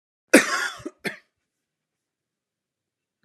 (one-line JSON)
{"cough_length": "3.2 s", "cough_amplitude": 32766, "cough_signal_mean_std_ratio": 0.22, "survey_phase": "beta (2021-08-13 to 2022-03-07)", "age": "45-64", "gender": "Male", "wearing_mask": "No", "symptom_none": true, "smoker_status": "Ex-smoker", "respiratory_condition_asthma": false, "respiratory_condition_other": false, "recruitment_source": "REACT", "submission_delay": "1 day", "covid_test_result": "Negative", "covid_test_method": "RT-qPCR"}